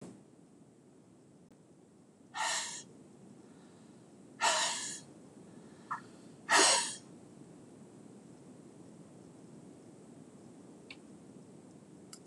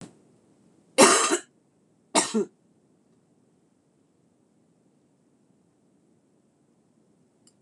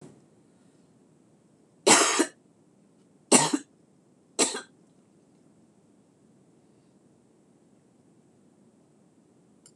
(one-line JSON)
{"exhalation_length": "12.3 s", "exhalation_amplitude": 7393, "exhalation_signal_mean_std_ratio": 0.36, "cough_length": "7.6 s", "cough_amplitude": 25737, "cough_signal_mean_std_ratio": 0.22, "three_cough_length": "9.8 s", "three_cough_amplitude": 23774, "three_cough_signal_mean_std_ratio": 0.23, "survey_phase": "beta (2021-08-13 to 2022-03-07)", "age": "65+", "gender": "Female", "wearing_mask": "No", "symptom_cough_any": true, "symptom_runny_or_blocked_nose": true, "symptom_loss_of_taste": true, "smoker_status": "Ex-smoker", "respiratory_condition_asthma": false, "respiratory_condition_other": true, "recruitment_source": "REACT", "submission_delay": "2 days", "covid_test_result": "Negative", "covid_test_method": "RT-qPCR", "influenza_a_test_result": "Negative", "influenza_b_test_result": "Negative"}